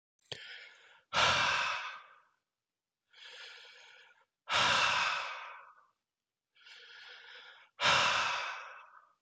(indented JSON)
{
  "exhalation_length": "9.2 s",
  "exhalation_amplitude": 5961,
  "exhalation_signal_mean_std_ratio": 0.46,
  "survey_phase": "beta (2021-08-13 to 2022-03-07)",
  "age": "45-64",
  "gender": "Male",
  "wearing_mask": "No",
  "symptom_cough_any": true,
  "symptom_new_continuous_cough": true,
  "symptom_runny_or_blocked_nose": true,
  "symptom_shortness_of_breath": true,
  "symptom_sore_throat": true,
  "symptom_diarrhoea": true,
  "symptom_fever_high_temperature": true,
  "symptom_headache": true,
  "symptom_change_to_sense_of_smell_or_taste": true,
  "symptom_loss_of_taste": true,
  "symptom_onset": "8 days",
  "smoker_status": "Never smoked",
  "respiratory_condition_asthma": true,
  "respiratory_condition_other": false,
  "recruitment_source": "Test and Trace",
  "submission_delay": "1 day",
  "covid_test_result": "Negative",
  "covid_test_method": "RT-qPCR"
}